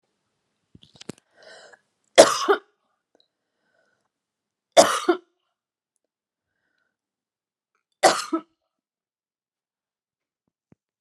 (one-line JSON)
{"three_cough_length": "11.0 s", "three_cough_amplitude": 32768, "three_cough_signal_mean_std_ratio": 0.19, "survey_phase": "beta (2021-08-13 to 2022-03-07)", "age": "45-64", "gender": "Female", "wearing_mask": "No", "symptom_none": true, "smoker_status": "Never smoked", "respiratory_condition_asthma": false, "respiratory_condition_other": false, "recruitment_source": "REACT", "submission_delay": "1 day", "covid_test_result": "Negative", "covid_test_method": "RT-qPCR"}